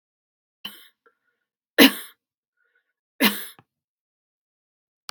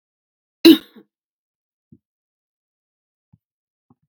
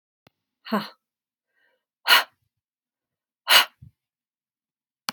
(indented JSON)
{
  "three_cough_length": "5.1 s",
  "three_cough_amplitude": 32767,
  "three_cough_signal_mean_std_ratio": 0.18,
  "cough_length": "4.1 s",
  "cough_amplitude": 32768,
  "cough_signal_mean_std_ratio": 0.14,
  "exhalation_length": "5.1 s",
  "exhalation_amplitude": 30821,
  "exhalation_signal_mean_std_ratio": 0.21,
  "survey_phase": "beta (2021-08-13 to 2022-03-07)",
  "age": "45-64",
  "gender": "Female",
  "wearing_mask": "No",
  "symptom_none": true,
  "smoker_status": "Never smoked",
  "respiratory_condition_asthma": false,
  "respiratory_condition_other": false,
  "recruitment_source": "REACT",
  "submission_delay": "1 day",
  "covid_test_result": "Negative",
  "covid_test_method": "RT-qPCR",
  "influenza_a_test_result": "Negative",
  "influenza_b_test_result": "Negative"
}